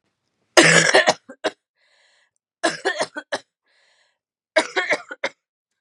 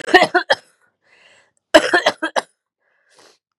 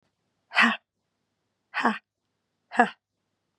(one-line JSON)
{"three_cough_length": "5.8 s", "three_cough_amplitude": 32768, "three_cough_signal_mean_std_ratio": 0.34, "cough_length": "3.6 s", "cough_amplitude": 32768, "cough_signal_mean_std_ratio": 0.32, "exhalation_length": "3.6 s", "exhalation_amplitude": 23624, "exhalation_signal_mean_std_ratio": 0.27, "survey_phase": "beta (2021-08-13 to 2022-03-07)", "age": "18-44", "gender": "Female", "wearing_mask": "No", "symptom_cough_any": true, "symptom_fatigue": true, "symptom_change_to_sense_of_smell_or_taste": true, "symptom_loss_of_taste": true, "symptom_onset": "3 days", "smoker_status": "Never smoked", "respiratory_condition_asthma": false, "respiratory_condition_other": false, "recruitment_source": "Test and Trace", "submission_delay": "2 days", "covid_test_result": "Positive", "covid_test_method": "LAMP"}